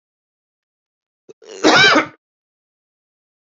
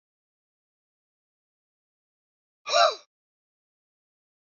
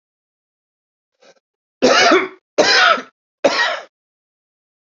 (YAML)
cough_length: 3.6 s
cough_amplitude: 30049
cough_signal_mean_std_ratio: 0.29
exhalation_length: 4.4 s
exhalation_amplitude: 14424
exhalation_signal_mean_std_ratio: 0.18
three_cough_length: 4.9 s
three_cough_amplitude: 30467
three_cough_signal_mean_std_ratio: 0.4
survey_phase: beta (2021-08-13 to 2022-03-07)
age: 45-64
gender: Male
wearing_mask: 'No'
symptom_sore_throat: true
symptom_fatigue: true
smoker_status: Current smoker (e-cigarettes or vapes only)
respiratory_condition_asthma: false
respiratory_condition_other: false
recruitment_source: REACT
submission_delay: 1 day
covid_test_result: Negative
covid_test_method: RT-qPCR
influenza_a_test_result: Negative
influenza_b_test_result: Negative